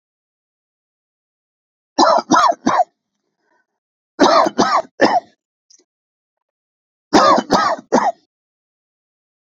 {"three_cough_length": "9.5 s", "three_cough_amplitude": 29971, "three_cough_signal_mean_std_ratio": 0.39, "survey_phase": "beta (2021-08-13 to 2022-03-07)", "age": "45-64", "gender": "Male", "wearing_mask": "No", "symptom_shortness_of_breath": true, "symptom_abdominal_pain": true, "symptom_diarrhoea": true, "symptom_fatigue": true, "symptom_headache": true, "smoker_status": "Never smoked", "respiratory_condition_asthma": false, "respiratory_condition_other": false, "recruitment_source": "REACT", "submission_delay": "1 day", "covid_test_result": "Negative", "covid_test_method": "RT-qPCR"}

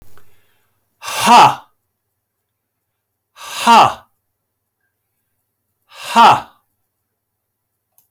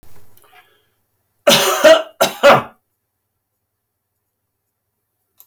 {"exhalation_length": "8.1 s", "exhalation_amplitude": 32768, "exhalation_signal_mean_std_ratio": 0.3, "cough_length": "5.5 s", "cough_amplitude": 31658, "cough_signal_mean_std_ratio": 0.31, "survey_phase": "beta (2021-08-13 to 2022-03-07)", "age": "65+", "gender": "Male", "wearing_mask": "No", "symptom_none": true, "smoker_status": "Never smoked", "respiratory_condition_asthma": false, "respiratory_condition_other": false, "recruitment_source": "REACT", "submission_delay": "3 days", "covid_test_result": "Negative", "covid_test_method": "RT-qPCR"}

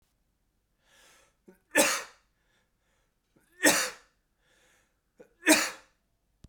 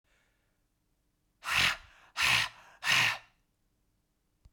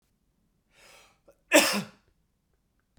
{"three_cough_length": "6.5 s", "three_cough_amplitude": 15366, "three_cough_signal_mean_std_ratio": 0.26, "exhalation_length": "4.5 s", "exhalation_amplitude": 7539, "exhalation_signal_mean_std_ratio": 0.38, "cough_length": "3.0 s", "cough_amplitude": 18241, "cough_signal_mean_std_ratio": 0.23, "survey_phase": "beta (2021-08-13 to 2022-03-07)", "age": "45-64", "gender": "Male", "wearing_mask": "No", "symptom_none": true, "smoker_status": "Never smoked", "respiratory_condition_asthma": false, "respiratory_condition_other": false, "recruitment_source": "REACT", "submission_delay": "0 days", "covid_test_result": "Negative", "covid_test_method": "RT-qPCR"}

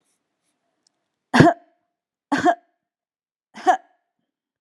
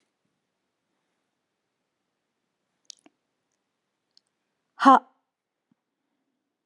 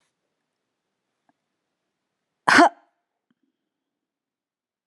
{"three_cough_length": "4.6 s", "three_cough_amplitude": 32767, "three_cough_signal_mean_std_ratio": 0.25, "exhalation_length": "6.7 s", "exhalation_amplitude": 26626, "exhalation_signal_mean_std_ratio": 0.12, "cough_length": "4.9 s", "cough_amplitude": 31534, "cough_signal_mean_std_ratio": 0.16, "survey_phase": "beta (2021-08-13 to 2022-03-07)", "age": "45-64", "gender": "Female", "wearing_mask": "No", "symptom_none": true, "smoker_status": "Ex-smoker", "respiratory_condition_asthma": false, "respiratory_condition_other": false, "recruitment_source": "REACT", "submission_delay": "1 day", "covid_test_result": "Negative", "covid_test_method": "RT-qPCR"}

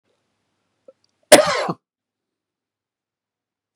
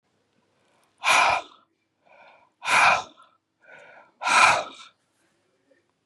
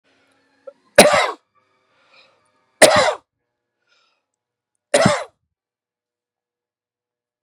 {"cough_length": "3.8 s", "cough_amplitude": 32768, "cough_signal_mean_std_ratio": 0.19, "exhalation_length": "6.1 s", "exhalation_amplitude": 25418, "exhalation_signal_mean_std_ratio": 0.36, "three_cough_length": "7.4 s", "three_cough_amplitude": 32768, "three_cough_signal_mean_std_ratio": 0.26, "survey_phase": "beta (2021-08-13 to 2022-03-07)", "age": "65+", "gender": "Male", "wearing_mask": "No", "symptom_none": true, "smoker_status": "Never smoked", "respiratory_condition_asthma": false, "respiratory_condition_other": false, "recruitment_source": "REACT", "submission_delay": "1 day", "covid_test_result": "Negative", "covid_test_method": "RT-qPCR", "influenza_a_test_result": "Negative", "influenza_b_test_result": "Negative"}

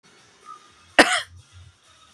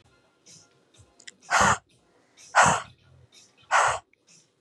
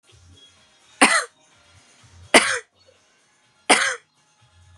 {"cough_length": "2.1 s", "cough_amplitude": 32767, "cough_signal_mean_std_ratio": 0.24, "exhalation_length": "4.6 s", "exhalation_amplitude": 21909, "exhalation_signal_mean_std_ratio": 0.34, "three_cough_length": "4.8 s", "three_cough_amplitude": 32767, "three_cough_signal_mean_std_ratio": 0.28, "survey_phase": "beta (2021-08-13 to 2022-03-07)", "age": "18-44", "gender": "Female", "wearing_mask": "No", "symptom_none": true, "smoker_status": "Current smoker (1 to 10 cigarettes per day)", "respiratory_condition_asthma": false, "respiratory_condition_other": false, "recruitment_source": "REACT", "submission_delay": "1 day", "covid_test_result": "Negative", "covid_test_method": "RT-qPCR"}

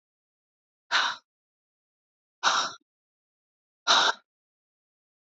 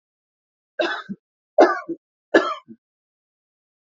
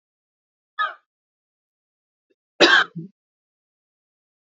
{"exhalation_length": "5.3 s", "exhalation_amplitude": 16068, "exhalation_signal_mean_std_ratio": 0.29, "three_cough_length": "3.8 s", "three_cough_amplitude": 27547, "three_cough_signal_mean_std_ratio": 0.28, "cough_length": "4.4 s", "cough_amplitude": 28221, "cough_signal_mean_std_ratio": 0.22, "survey_phase": "alpha (2021-03-01 to 2021-08-12)", "age": "45-64", "gender": "Female", "wearing_mask": "No", "symptom_none": true, "smoker_status": "Ex-smoker", "respiratory_condition_asthma": false, "respiratory_condition_other": false, "recruitment_source": "REACT", "submission_delay": "3 days", "covid_test_result": "Negative", "covid_test_method": "RT-qPCR"}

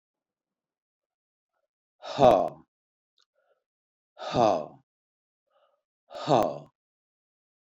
{"exhalation_length": "7.7 s", "exhalation_amplitude": 16945, "exhalation_signal_mean_std_ratio": 0.25, "survey_phase": "beta (2021-08-13 to 2022-03-07)", "age": "65+", "gender": "Male", "wearing_mask": "No", "symptom_runny_or_blocked_nose": true, "symptom_onset": "7 days", "smoker_status": "Ex-smoker", "respiratory_condition_asthma": false, "respiratory_condition_other": false, "recruitment_source": "Test and Trace", "submission_delay": "2 days", "covid_test_result": "Positive", "covid_test_method": "RT-qPCR", "covid_ct_value": 25.3, "covid_ct_gene": "ORF1ab gene"}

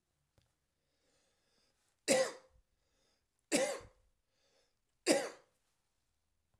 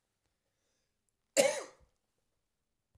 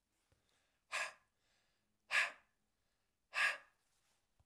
{"three_cough_length": "6.6 s", "three_cough_amplitude": 7196, "three_cough_signal_mean_std_ratio": 0.26, "cough_length": "3.0 s", "cough_amplitude": 10021, "cough_signal_mean_std_ratio": 0.21, "exhalation_length": "4.5 s", "exhalation_amplitude": 2511, "exhalation_signal_mean_std_ratio": 0.28, "survey_phase": "beta (2021-08-13 to 2022-03-07)", "age": "45-64", "gender": "Male", "wearing_mask": "No", "symptom_cough_any": true, "symptom_runny_or_blocked_nose": true, "symptom_fatigue": true, "symptom_onset": "2 days", "smoker_status": "Never smoked", "respiratory_condition_asthma": false, "respiratory_condition_other": false, "recruitment_source": "Test and Trace", "submission_delay": "1 day", "covid_test_result": "Positive", "covid_test_method": "RT-qPCR", "covid_ct_value": 18.2, "covid_ct_gene": "ORF1ab gene", "covid_ct_mean": 18.8, "covid_viral_load": "680000 copies/ml", "covid_viral_load_category": "Low viral load (10K-1M copies/ml)"}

